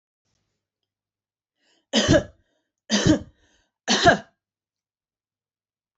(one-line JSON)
{"three_cough_length": "6.0 s", "three_cough_amplitude": 25675, "three_cough_signal_mean_std_ratio": 0.29, "survey_phase": "alpha (2021-03-01 to 2021-08-12)", "age": "45-64", "gender": "Female", "wearing_mask": "No", "symptom_none": true, "smoker_status": "Ex-smoker", "respiratory_condition_asthma": false, "respiratory_condition_other": false, "recruitment_source": "REACT", "submission_delay": "2 days", "covid_test_result": "Negative", "covid_test_method": "RT-qPCR"}